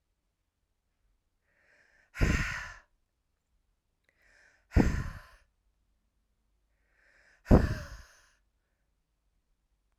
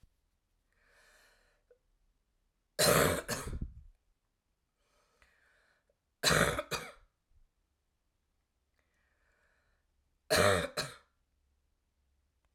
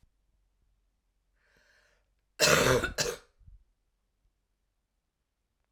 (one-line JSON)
{"exhalation_length": "10.0 s", "exhalation_amplitude": 11838, "exhalation_signal_mean_std_ratio": 0.23, "three_cough_length": "12.5 s", "three_cough_amplitude": 8558, "three_cough_signal_mean_std_ratio": 0.28, "cough_length": "5.7 s", "cough_amplitude": 14543, "cough_signal_mean_std_ratio": 0.27, "survey_phase": "alpha (2021-03-01 to 2021-08-12)", "age": "18-44", "gender": "Female", "wearing_mask": "No", "symptom_cough_any": true, "symptom_fatigue": true, "symptom_change_to_sense_of_smell_or_taste": true, "symptom_loss_of_taste": true, "symptom_onset": "3 days", "smoker_status": "Never smoked", "respiratory_condition_asthma": false, "respiratory_condition_other": false, "recruitment_source": "Test and Trace", "submission_delay": "2 days", "covid_test_result": "Positive", "covid_test_method": "RT-qPCR", "covid_ct_value": 13.3, "covid_ct_gene": "ORF1ab gene", "covid_ct_mean": 13.7, "covid_viral_load": "33000000 copies/ml", "covid_viral_load_category": "High viral load (>1M copies/ml)"}